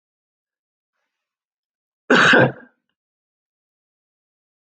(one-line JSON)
{"cough_length": "4.6 s", "cough_amplitude": 27208, "cough_signal_mean_std_ratio": 0.24, "survey_phase": "alpha (2021-03-01 to 2021-08-12)", "age": "65+", "gender": "Male", "wearing_mask": "No", "symptom_fatigue": true, "symptom_onset": "5 days", "smoker_status": "Never smoked", "respiratory_condition_asthma": false, "respiratory_condition_other": false, "recruitment_source": "REACT", "submission_delay": "1 day", "covid_test_result": "Negative", "covid_test_method": "RT-qPCR"}